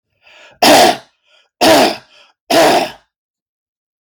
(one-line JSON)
{"three_cough_length": "4.0 s", "three_cough_amplitude": 32768, "three_cough_signal_mean_std_ratio": 0.47, "survey_phase": "beta (2021-08-13 to 2022-03-07)", "age": "45-64", "gender": "Male", "wearing_mask": "No", "symptom_none": true, "smoker_status": "Ex-smoker", "respiratory_condition_asthma": false, "respiratory_condition_other": false, "recruitment_source": "REACT", "submission_delay": "1 day", "covid_test_result": "Negative", "covid_test_method": "RT-qPCR"}